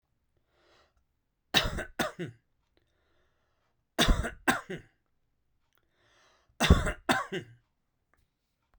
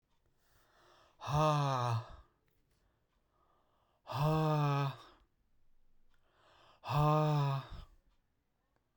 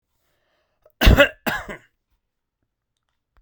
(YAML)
three_cough_length: 8.8 s
three_cough_amplitude: 19671
three_cough_signal_mean_std_ratio: 0.28
exhalation_length: 9.0 s
exhalation_amplitude: 3190
exhalation_signal_mean_std_ratio: 0.49
cough_length: 3.4 s
cough_amplitude: 32767
cough_signal_mean_std_ratio: 0.24
survey_phase: beta (2021-08-13 to 2022-03-07)
age: 45-64
gender: Male
wearing_mask: 'No'
symptom_none: true
smoker_status: Never smoked
respiratory_condition_asthma: false
respiratory_condition_other: false
recruitment_source: REACT
submission_delay: 3 days
covid_test_result: Negative
covid_test_method: RT-qPCR